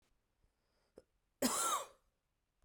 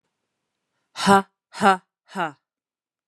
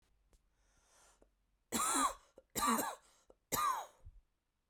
{"cough_length": "2.6 s", "cough_amplitude": 2883, "cough_signal_mean_std_ratio": 0.33, "exhalation_length": "3.1 s", "exhalation_amplitude": 30144, "exhalation_signal_mean_std_ratio": 0.27, "three_cough_length": "4.7 s", "three_cough_amplitude": 3453, "three_cough_signal_mean_std_ratio": 0.42, "survey_phase": "beta (2021-08-13 to 2022-03-07)", "age": "18-44", "gender": "Female", "wearing_mask": "No", "symptom_sore_throat": true, "symptom_onset": "7 days", "smoker_status": "Never smoked", "respiratory_condition_asthma": false, "respiratory_condition_other": false, "recruitment_source": "Test and Trace", "submission_delay": "2 days", "covid_test_result": "Positive", "covid_test_method": "RT-qPCR", "covid_ct_value": 28.4, "covid_ct_gene": "ORF1ab gene"}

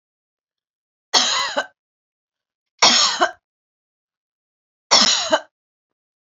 {"three_cough_length": "6.3 s", "three_cough_amplitude": 32768, "three_cough_signal_mean_std_ratio": 0.35, "survey_phase": "beta (2021-08-13 to 2022-03-07)", "age": "65+", "gender": "Female", "wearing_mask": "No", "symptom_none": true, "smoker_status": "Never smoked", "respiratory_condition_asthma": false, "respiratory_condition_other": false, "recruitment_source": "REACT", "submission_delay": "2 days", "covid_test_result": "Negative", "covid_test_method": "RT-qPCR", "influenza_a_test_result": "Negative", "influenza_b_test_result": "Negative"}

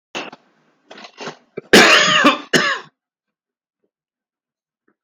{"cough_length": "5.0 s", "cough_amplitude": 32768, "cough_signal_mean_std_ratio": 0.35, "survey_phase": "beta (2021-08-13 to 2022-03-07)", "age": "45-64", "gender": "Male", "wearing_mask": "No", "symptom_none": true, "smoker_status": "Ex-smoker", "respiratory_condition_asthma": false, "respiratory_condition_other": false, "recruitment_source": "REACT", "submission_delay": "4 days", "covid_test_result": "Negative", "covid_test_method": "RT-qPCR", "influenza_a_test_result": "Negative", "influenza_b_test_result": "Negative"}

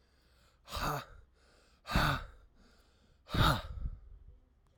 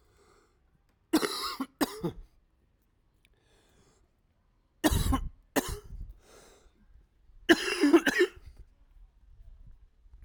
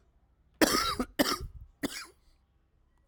{"exhalation_length": "4.8 s", "exhalation_amplitude": 5175, "exhalation_signal_mean_std_ratio": 0.4, "three_cough_length": "10.2 s", "three_cough_amplitude": 16756, "three_cough_signal_mean_std_ratio": 0.33, "cough_length": "3.1 s", "cough_amplitude": 11478, "cough_signal_mean_std_ratio": 0.38, "survey_phase": "alpha (2021-03-01 to 2021-08-12)", "age": "18-44", "gender": "Male", "wearing_mask": "No", "symptom_cough_any": true, "symptom_shortness_of_breath": true, "symptom_fatigue": true, "symptom_change_to_sense_of_smell_or_taste": true, "symptom_loss_of_taste": true, "symptom_onset": "3 days", "smoker_status": "Current smoker (e-cigarettes or vapes only)", "respiratory_condition_asthma": false, "respiratory_condition_other": false, "recruitment_source": "Test and Trace", "submission_delay": "2 days", "covid_test_result": "Positive", "covid_test_method": "RT-qPCR", "covid_ct_value": 13.9, "covid_ct_gene": "ORF1ab gene", "covid_ct_mean": 15.2, "covid_viral_load": "10000000 copies/ml", "covid_viral_load_category": "High viral load (>1M copies/ml)"}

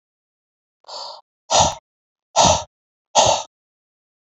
{"exhalation_length": "4.3 s", "exhalation_amplitude": 29346, "exhalation_signal_mean_std_ratio": 0.34, "survey_phase": "beta (2021-08-13 to 2022-03-07)", "age": "45-64", "gender": "Male", "wearing_mask": "No", "symptom_none": true, "smoker_status": "Never smoked", "respiratory_condition_asthma": false, "respiratory_condition_other": false, "recruitment_source": "Test and Trace", "submission_delay": "2 days", "covid_test_result": "Positive", "covid_test_method": "RT-qPCR", "covid_ct_value": 20.9, "covid_ct_gene": "N gene", "covid_ct_mean": 21.7, "covid_viral_load": "77000 copies/ml", "covid_viral_load_category": "Low viral load (10K-1M copies/ml)"}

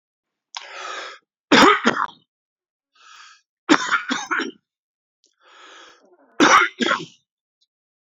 {"cough_length": "8.2 s", "cough_amplitude": 31101, "cough_signal_mean_std_ratio": 0.33, "survey_phase": "beta (2021-08-13 to 2022-03-07)", "age": "45-64", "gender": "Male", "wearing_mask": "No", "symptom_none": true, "smoker_status": "Current smoker (11 or more cigarettes per day)", "respiratory_condition_asthma": false, "respiratory_condition_other": false, "recruitment_source": "REACT", "submission_delay": "0 days", "covid_test_result": "Negative", "covid_test_method": "RT-qPCR"}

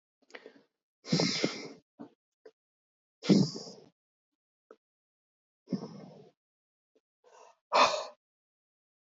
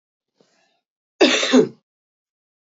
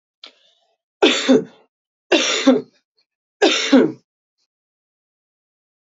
{"exhalation_length": "9.0 s", "exhalation_amplitude": 9899, "exhalation_signal_mean_std_ratio": 0.27, "cough_length": "2.7 s", "cough_amplitude": 26411, "cough_signal_mean_std_ratio": 0.31, "three_cough_length": "5.9 s", "three_cough_amplitude": 28632, "three_cough_signal_mean_std_ratio": 0.36, "survey_phase": "beta (2021-08-13 to 2022-03-07)", "age": "18-44", "gender": "Female", "wearing_mask": "No", "symptom_runny_or_blocked_nose": true, "smoker_status": "Never smoked", "respiratory_condition_asthma": false, "respiratory_condition_other": false, "recruitment_source": "Test and Trace", "submission_delay": "1 day", "covid_test_result": "Positive", "covid_test_method": "LFT"}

